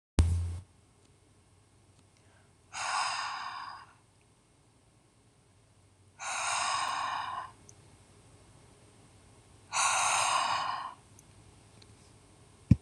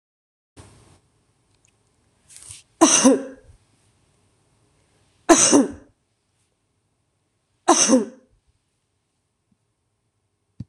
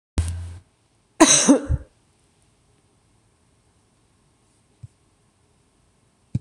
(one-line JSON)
{"exhalation_length": "12.8 s", "exhalation_amplitude": 18336, "exhalation_signal_mean_std_ratio": 0.43, "three_cough_length": "10.7 s", "three_cough_amplitude": 26027, "three_cough_signal_mean_std_ratio": 0.26, "cough_length": "6.4 s", "cough_amplitude": 26027, "cough_signal_mean_std_ratio": 0.25, "survey_phase": "alpha (2021-03-01 to 2021-08-12)", "age": "45-64", "gender": "Female", "wearing_mask": "No", "symptom_none": true, "smoker_status": "Never smoked", "respiratory_condition_asthma": false, "respiratory_condition_other": false, "recruitment_source": "REACT", "submission_delay": "1 day", "covid_test_result": "Negative", "covid_test_method": "RT-qPCR"}